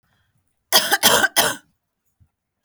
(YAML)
three_cough_length: 2.6 s
three_cough_amplitude: 32768
three_cough_signal_mean_std_ratio: 0.38
survey_phase: beta (2021-08-13 to 2022-03-07)
age: 18-44
gender: Female
wearing_mask: 'No'
symptom_cough_any: true
symptom_fatigue: true
smoker_status: Never smoked
respiratory_condition_asthma: false
respiratory_condition_other: false
recruitment_source: REACT
submission_delay: 3 days
covid_test_result: Negative
covid_test_method: RT-qPCR
influenza_a_test_result: Negative
influenza_b_test_result: Negative